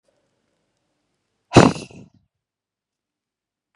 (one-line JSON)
{"exhalation_length": "3.8 s", "exhalation_amplitude": 32768, "exhalation_signal_mean_std_ratio": 0.17, "survey_phase": "beta (2021-08-13 to 2022-03-07)", "age": "18-44", "gender": "Female", "wearing_mask": "No", "symptom_cough_any": true, "symptom_shortness_of_breath": true, "symptom_abdominal_pain": true, "symptom_diarrhoea": true, "symptom_fatigue": true, "symptom_fever_high_temperature": true, "symptom_onset": "3 days", "smoker_status": "Never smoked", "respiratory_condition_asthma": true, "respiratory_condition_other": false, "recruitment_source": "Test and Trace", "submission_delay": "2 days", "covid_test_result": "Positive", "covid_test_method": "RT-qPCR", "covid_ct_value": 17.4, "covid_ct_gene": "ORF1ab gene", "covid_ct_mean": 17.7, "covid_viral_load": "1500000 copies/ml", "covid_viral_load_category": "High viral load (>1M copies/ml)"}